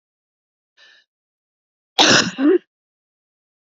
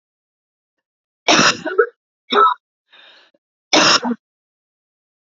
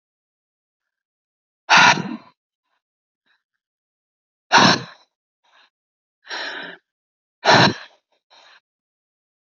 cough_length: 3.8 s
cough_amplitude: 32768
cough_signal_mean_std_ratio: 0.3
three_cough_length: 5.3 s
three_cough_amplitude: 31826
three_cough_signal_mean_std_ratio: 0.36
exhalation_length: 9.6 s
exhalation_amplitude: 30117
exhalation_signal_mean_std_ratio: 0.26
survey_phase: beta (2021-08-13 to 2022-03-07)
age: 45-64
gender: Female
wearing_mask: 'No'
symptom_cough_any: true
symptom_new_continuous_cough: true
symptom_runny_or_blocked_nose: true
symptom_shortness_of_breath: true
symptom_sore_throat: true
symptom_change_to_sense_of_smell_or_taste: true
symptom_loss_of_taste: true
symptom_onset: 9 days
smoker_status: Never smoked
respiratory_condition_asthma: false
respiratory_condition_other: false
recruitment_source: Test and Trace
submission_delay: 1 day
covid_test_result: Positive
covid_test_method: RT-qPCR
covid_ct_value: 17.2
covid_ct_gene: ORF1ab gene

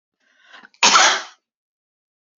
cough_length: 2.4 s
cough_amplitude: 31182
cough_signal_mean_std_ratio: 0.32
survey_phase: beta (2021-08-13 to 2022-03-07)
age: 65+
gender: Female
wearing_mask: 'No'
symptom_none: true
smoker_status: Ex-smoker
respiratory_condition_asthma: false
respiratory_condition_other: false
recruitment_source: REACT
submission_delay: 1 day
covid_test_result: Negative
covid_test_method: RT-qPCR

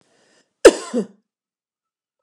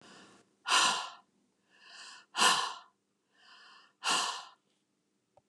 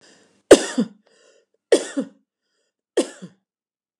cough_length: 2.2 s
cough_amplitude: 32768
cough_signal_mean_std_ratio: 0.19
exhalation_length: 5.5 s
exhalation_amplitude: 10817
exhalation_signal_mean_std_ratio: 0.37
three_cough_length: 4.0 s
three_cough_amplitude: 32768
three_cough_signal_mean_std_ratio: 0.22
survey_phase: beta (2021-08-13 to 2022-03-07)
age: 65+
gender: Female
wearing_mask: 'No'
symptom_none: true
smoker_status: Never smoked
respiratory_condition_asthma: false
respiratory_condition_other: false
recruitment_source: REACT
submission_delay: 2 days
covid_test_result: Negative
covid_test_method: RT-qPCR
influenza_a_test_result: Negative
influenza_b_test_result: Negative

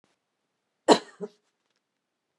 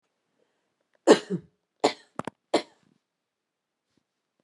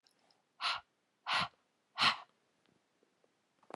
cough_length: 2.4 s
cough_amplitude: 23340
cough_signal_mean_std_ratio: 0.16
three_cough_length: 4.4 s
three_cough_amplitude: 24388
three_cough_signal_mean_std_ratio: 0.19
exhalation_length: 3.8 s
exhalation_amplitude: 4735
exhalation_signal_mean_std_ratio: 0.3
survey_phase: beta (2021-08-13 to 2022-03-07)
age: 65+
gender: Female
wearing_mask: 'No'
symptom_none: true
smoker_status: Ex-smoker
respiratory_condition_asthma: false
respiratory_condition_other: false
recruitment_source: REACT
submission_delay: 1 day
covid_test_result: Negative
covid_test_method: RT-qPCR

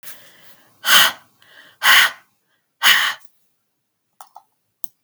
exhalation_length: 5.0 s
exhalation_amplitude: 32768
exhalation_signal_mean_std_ratio: 0.33
survey_phase: beta (2021-08-13 to 2022-03-07)
age: 65+
gender: Female
wearing_mask: 'No'
symptom_none: true
smoker_status: Ex-smoker
respiratory_condition_asthma: false
respiratory_condition_other: false
recruitment_source: REACT
submission_delay: 2 days
covid_test_result: Negative
covid_test_method: RT-qPCR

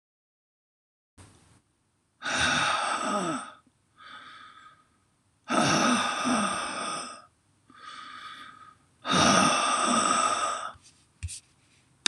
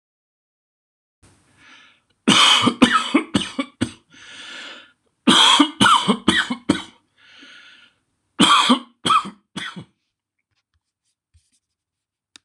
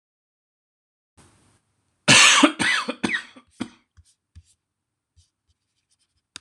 exhalation_length: 12.1 s
exhalation_amplitude: 21765
exhalation_signal_mean_std_ratio: 0.54
three_cough_length: 12.4 s
three_cough_amplitude: 26028
three_cough_signal_mean_std_ratio: 0.38
cough_length: 6.4 s
cough_amplitude: 26027
cough_signal_mean_std_ratio: 0.27
survey_phase: beta (2021-08-13 to 2022-03-07)
age: 65+
gender: Male
wearing_mask: 'No'
symptom_none: true
smoker_status: Ex-smoker
respiratory_condition_asthma: false
respiratory_condition_other: false
recruitment_source: REACT
submission_delay: 3 days
covid_test_result: Negative
covid_test_method: RT-qPCR
influenza_a_test_result: Negative
influenza_b_test_result: Negative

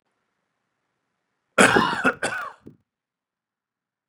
cough_length: 4.1 s
cough_amplitude: 29785
cough_signal_mean_std_ratio: 0.29
survey_phase: beta (2021-08-13 to 2022-03-07)
age: 18-44
gender: Male
wearing_mask: 'No'
symptom_none: true
smoker_status: Never smoked
respiratory_condition_asthma: false
respiratory_condition_other: false
recruitment_source: Test and Trace
submission_delay: 1 day
covid_test_result: Positive
covid_test_method: RT-qPCR
covid_ct_value: 29.6
covid_ct_gene: ORF1ab gene
covid_ct_mean: 30.4
covid_viral_load: 110 copies/ml
covid_viral_load_category: Minimal viral load (< 10K copies/ml)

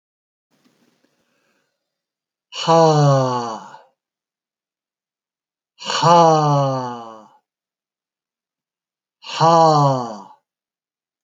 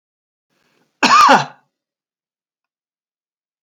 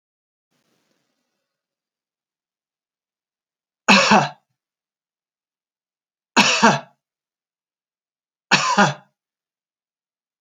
exhalation_length: 11.2 s
exhalation_amplitude: 28326
exhalation_signal_mean_std_ratio: 0.39
cough_length: 3.6 s
cough_amplitude: 32767
cough_signal_mean_std_ratio: 0.28
three_cough_length: 10.4 s
three_cough_amplitude: 31045
three_cough_signal_mean_std_ratio: 0.25
survey_phase: alpha (2021-03-01 to 2021-08-12)
age: 65+
gender: Male
wearing_mask: 'No'
symptom_none: true
smoker_status: Ex-smoker
respiratory_condition_asthma: false
respiratory_condition_other: false
recruitment_source: REACT
submission_delay: 2 days
covid_test_result: Negative
covid_test_method: RT-qPCR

